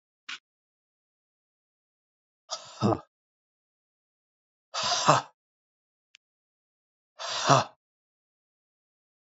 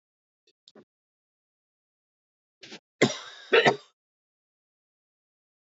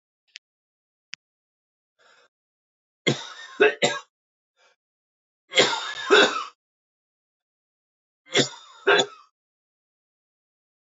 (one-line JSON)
{"exhalation_length": "9.2 s", "exhalation_amplitude": 22293, "exhalation_signal_mean_std_ratio": 0.24, "cough_length": "5.6 s", "cough_amplitude": 17692, "cough_signal_mean_std_ratio": 0.19, "three_cough_length": "10.9 s", "three_cough_amplitude": 23225, "three_cough_signal_mean_std_ratio": 0.27, "survey_phase": "beta (2021-08-13 to 2022-03-07)", "age": "18-44", "gender": "Male", "wearing_mask": "No", "symptom_cough_any": true, "symptom_runny_or_blocked_nose": true, "symptom_fever_high_temperature": true, "symptom_onset": "40 days", "smoker_status": "Never smoked", "respiratory_condition_asthma": false, "respiratory_condition_other": false, "recruitment_source": "Test and Trace", "submission_delay": "1 day", "covid_test_result": "Positive", "covid_test_method": "ePCR"}